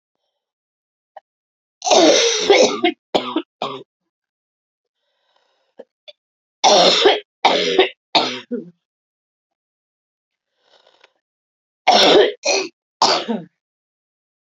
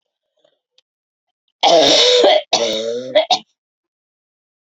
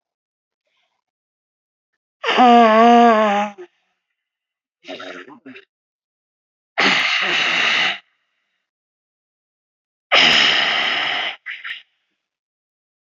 {"three_cough_length": "14.5 s", "three_cough_amplitude": 32767, "three_cough_signal_mean_std_ratio": 0.39, "cough_length": "4.8 s", "cough_amplitude": 32768, "cough_signal_mean_std_ratio": 0.46, "exhalation_length": "13.1 s", "exhalation_amplitude": 29933, "exhalation_signal_mean_std_ratio": 0.42, "survey_phase": "beta (2021-08-13 to 2022-03-07)", "age": "18-44", "gender": "Female", "wearing_mask": "No", "symptom_cough_any": true, "symptom_runny_or_blocked_nose": true, "symptom_sore_throat": true, "symptom_diarrhoea": true, "symptom_fatigue": true, "symptom_fever_high_temperature": true, "symptom_headache": true, "symptom_change_to_sense_of_smell_or_taste": true, "symptom_loss_of_taste": true, "symptom_onset": "3 days", "smoker_status": "Never smoked", "respiratory_condition_asthma": true, "respiratory_condition_other": false, "recruitment_source": "Test and Trace", "submission_delay": "2 days", "covid_test_result": "Positive", "covid_test_method": "RT-qPCR"}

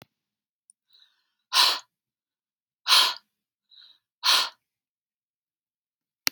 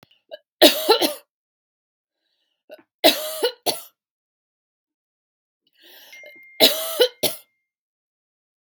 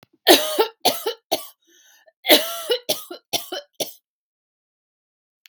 {"exhalation_length": "6.3 s", "exhalation_amplitude": 31693, "exhalation_signal_mean_std_ratio": 0.26, "three_cough_length": "8.7 s", "three_cough_amplitude": 32768, "three_cough_signal_mean_std_ratio": 0.28, "cough_length": "5.5 s", "cough_amplitude": 32768, "cough_signal_mean_std_ratio": 0.34, "survey_phase": "beta (2021-08-13 to 2022-03-07)", "age": "18-44", "gender": "Female", "wearing_mask": "No", "symptom_none": true, "smoker_status": "Never smoked", "respiratory_condition_asthma": false, "respiratory_condition_other": false, "recruitment_source": "REACT", "submission_delay": "3 days", "covid_test_result": "Negative", "covid_test_method": "RT-qPCR", "influenza_a_test_result": "Negative", "influenza_b_test_result": "Negative"}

